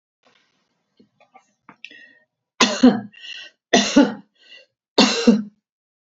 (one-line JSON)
{"three_cough_length": "6.1 s", "three_cough_amplitude": 32767, "three_cough_signal_mean_std_ratio": 0.32, "survey_phase": "beta (2021-08-13 to 2022-03-07)", "age": "65+", "gender": "Female", "wearing_mask": "No", "symptom_none": true, "smoker_status": "Never smoked", "respiratory_condition_asthma": false, "respiratory_condition_other": false, "recruitment_source": "REACT", "submission_delay": "3 days", "covid_test_result": "Negative", "covid_test_method": "RT-qPCR", "influenza_a_test_result": "Negative", "influenza_b_test_result": "Negative"}